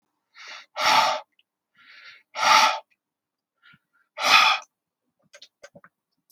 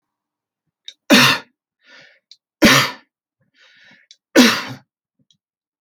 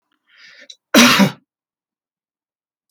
{
  "exhalation_length": "6.3 s",
  "exhalation_amplitude": 26234,
  "exhalation_signal_mean_std_ratio": 0.35,
  "three_cough_length": "5.8 s",
  "three_cough_amplitude": 32425,
  "three_cough_signal_mean_std_ratio": 0.3,
  "cough_length": "2.9 s",
  "cough_amplitude": 32768,
  "cough_signal_mean_std_ratio": 0.29,
  "survey_phase": "alpha (2021-03-01 to 2021-08-12)",
  "age": "45-64",
  "gender": "Male",
  "wearing_mask": "No",
  "symptom_none": true,
  "smoker_status": "Ex-smoker",
  "respiratory_condition_asthma": false,
  "respiratory_condition_other": false,
  "recruitment_source": "REACT",
  "submission_delay": "2 days",
  "covid_test_result": "Negative",
  "covid_test_method": "RT-qPCR"
}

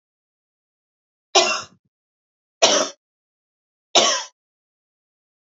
{
  "three_cough_length": "5.5 s",
  "three_cough_amplitude": 32062,
  "three_cough_signal_mean_std_ratio": 0.28,
  "survey_phase": "beta (2021-08-13 to 2022-03-07)",
  "age": "45-64",
  "gender": "Female",
  "wearing_mask": "No",
  "symptom_none": true,
  "smoker_status": "Ex-smoker",
  "respiratory_condition_asthma": false,
  "respiratory_condition_other": false,
  "recruitment_source": "REACT",
  "submission_delay": "3 days",
  "covid_test_result": "Negative",
  "covid_test_method": "RT-qPCR",
  "influenza_a_test_result": "Negative",
  "influenza_b_test_result": "Negative"
}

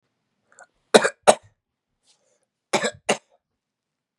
{
  "cough_length": "4.2 s",
  "cough_amplitude": 32768,
  "cough_signal_mean_std_ratio": 0.2,
  "survey_phase": "beta (2021-08-13 to 2022-03-07)",
  "age": "18-44",
  "gender": "Male",
  "wearing_mask": "No",
  "symptom_runny_or_blocked_nose": true,
  "symptom_sore_throat": true,
  "symptom_fatigue": true,
  "symptom_headache": true,
  "symptom_other": true,
  "smoker_status": "Never smoked",
  "respiratory_condition_asthma": true,
  "respiratory_condition_other": false,
  "recruitment_source": "Test and Trace",
  "submission_delay": "1 day",
  "covid_test_result": "Positive",
  "covid_test_method": "RT-qPCR"
}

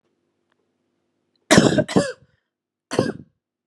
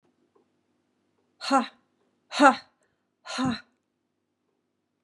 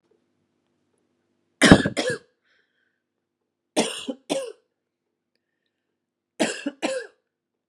{
  "cough_length": "3.7 s",
  "cough_amplitude": 32767,
  "cough_signal_mean_std_ratio": 0.3,
  "exhalation_length": "5.0 s",
  "exhalation_amplitude": 26317,
  "exhalation_signal_mean_std_ratio": 0.24,
  "three_cough_length": "7.7 s",
  "three_cough_amplitude": 32768,
  "three_cough_signal_mean_std_ratio": 0.24,
  "survey_phase": "beta (2021-08-13 to 2022-03-07)",
  "age": "45-64",
  "gender": "Female",
  "wearing_mask": "No",
  "symptom_none": true,
  "smoker_status": "Never smoked",
  "respiratory_condition_asthma": false,
  "respiratory_condition_other": false,
  "recruitment_source": "REACT",
  "submission_delay": "1 day",
  "covid_test_result": "Negative",
  "covid_test_method": "RT-qPCR",
  "influenza_a_test_result": "Negative",
  "influenza_b_test_result": "Negative"
}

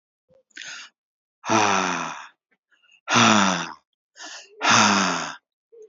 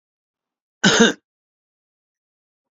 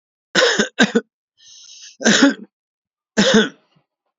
{
  "exhalation_length": "5.9 s",
  "exhalation_amplitude": 26839,
  "exhalation_signal_mean_std_ratio": 0.47,
  "cough_length": "2.7 s",
  "cough_amplitude": 30090,
  "cough_signal_mean_std_ratio": 0.25,
  "three_cough_length": "4.2 s",
  "three_cough_amplitude": 32767,
  "three_cough_signal_mean_std_ratio": 0.42,
  "survey_phase": "alpha (2021-03-01 to 2021-08-12)",
  "age": "45-64",
  "gender": "Male",
  "wearing_mask": "No",
  "symptom_none": true,
  "smoker_status": "Ex-smoker",
  "respiratory_condition_asthma": false,
  "respiratory_condition_other": true,
  "recruitment_source": "REACT",
  "submission_delay": "3 days",
  "covid_test_result": "Negative",
  "covid_test_method": "RT-qPCR"
}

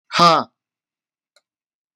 {
  "exhalation_length": "2.0 s",
  "exhalation_amplitude": 32768,
  "exhalation_signal_mean_std_ratio": 0.29,
  "survey_phase": "beta (2021-08-13 to 2022-03-07)",
  "age": "18-44",
  "gender": "Male",
  "wearing_mask": "No",
  "symptom_none": true,
  "smoker_status": "Ex-smoker",
  "respiratory_condition_asthma": false,
  "respiratory_condition_other": false,
  "recruitment_source": "REACT",
  "submission_delay": "3 days",
  "covid_test_result": "Negative",
  "covid_test_method": "RT-qPCR",
  "influenza_a_test_result": "Negative",
  "influenza_b_test_result": "Negative"
}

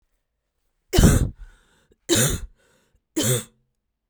{
  "three_cough_length": "4.1 s",
  "three_cough_amplitude": 30619,
  "three_cough_signal_mean_std_ratio": 0.37,
  "survey_phase": "beta (2021-08-13 to 2022-03-07)",
  "age": "18-44",
  "gender": "Female",
  "wearing_mask": "Yes",
  "symptom_cough_any": true,
  "symptom_runny_or_blocked_nose": true,
  "symptom_sore_throat": true,
  "symptom_fatigue": true,
  "symptom_headache": true,
  "symptom_change_to_sense_of_smell_or_taste": true,
  "symptom_loss_of_taste": true,
  "symptom_onset": "6 days",
  "smoker_status": "Never smoked",
  "respiratory_condition_asthma": false,
  "respiratory_condition_other": false,
  "recruitment_source": "Test and Trace",
  "submission_delay": "1 day",
  "covid_test_result": "Positive",
  "covid_test_method": "RT-qPCR"
}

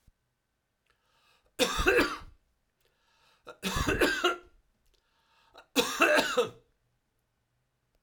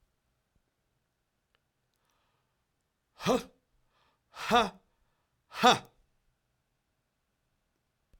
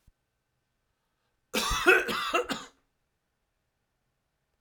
{
  "three_cough_length": "8.0 s",
  "three_cough_amplitude": 12826,
  "three_cough_signal_mean_std_ratio": 0.38,
  "exhalation_length": "8.2 s",
  "exhalation_amplitude": 12592,
  "exhalation_signal_mean_std_ratio": 0.2,
  "cough_length": "4.6 s",
  "cough_amplitude": 13972,
  "cough_signal_mean_std_ratio": 0.32,
  "survey_phase": "beta (2021-08-13 to 2022-03-07)",
  "age": "45-64",
  "gender": "Male",
  "wearing_mask": "No",
  "symptom_none": true,
  "smoker_status": "Never smoked",
  "respiratory_condition_asthma": false,
  "respiratory_condition_other": false,
  "recruitment_source": "REACT",
  "submission_delay": "1 day",
  "covid_test_result": "Negative",
  "covid_test_method": "RT-qPCR",
  "influenza_a_test_result": "Negative",
  "influenza_b_test_result": "Negative"
}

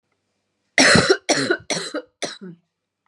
{
  "three_cough_length": "3.1 s",
  "three_cough_amplitude": 31652,
  "three_cough_signal_mean_std_ratio": 0.42,
  "survey_phase": "beta (2021-08-13 to 2022-03-07)",
  "age": "18-44",
  "gender": "Female",
  "wearing_mask": "No",
  "symptom_cough_any": true,
  "symptom_new_continuous_cough": true,
  "symptom_runny_or_blocked_nose": true,
  "symptom_shortness_of_breath": true,
  "symptom_sore_throat": true,
  "symptom_fatigue": true,
  "symptom_fever_high_temperature": true,
  "symptom_headache": true,
  "symptom_change_to_sense_of_smell_or_taste": true,
  "symptom_onset": "4 days",
  "smoker_status": "Ex-smoker",
  "respiratory_condition_asthma": false,
  "respiratory_condition_other": false,
  "recruitment_source": "Test and Trace",
  "submission_delay": "1 day",
  "covid_test_result": "Positive",
  "covid_test_method": "RT-qPCR",
  "covid_ct_value": 19.4,
  "covid_ct_gene": "N gene"
}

